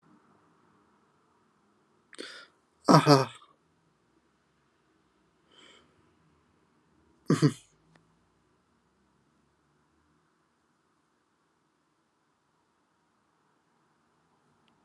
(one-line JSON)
{"exhalation_length": "14.8 s", "exhalation_amplitude": 26394, "exhalation_signal_mean_std_ratio": 0.15, "survey_phase": "alpha (2021-03-01 to 2021-08-12)", "age": "18-44", "gender": "Male", "wearing_mask": "Yes", "symptom_none": true, "smoker_status": "Never smoked", "respiratory_condition_asthma": false, "respiratory_condition_other": false, "recruitment_source": "Test and Trace", "submission_delay": "2 days", "covid_test_result": "Positive", "covid_test_method": "RT-qPCR", "covid_ct_value": 30.0, "covid_ct_gene": "ORF1ab gene", "covid_ct_mean": 30.7, "covid_viral_load": "86 copies/ml", "covid_viral_load_category": "Minimal viral load (< 10K copies/ml)"}